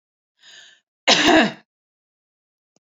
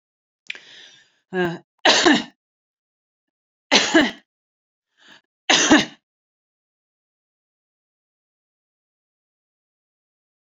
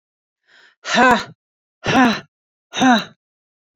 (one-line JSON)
{"cough_length": "2.8 s", "cough_amplitude": 29081, "cough_signal_mean_std_ratio": 0.31, "three_cough_length": "10.4 s", "three_cough_amplitude": 32768, "three_cough_signal_mean_std_ratio": 0.27, "exhalation_length": "3.8 s", "exhalation_amplitude": 27431, "exhalation_signal_mean_std_ratio": 0.4, "survey_phase": "beta (2021-08-13 to 2022-03-07)", "age": "45-64", "gender": "Female", "wearing_mask": "No", "symptom_none": true, "smoker_status": "Never smoked", "respiratory_condition_asthma": false, "respiratory_condition_other": false, "recruitment_source": "REACT", "submission_delay": "1 day", "covid_test_result": "Negative", "covid_test_method": "RT-qPCR"}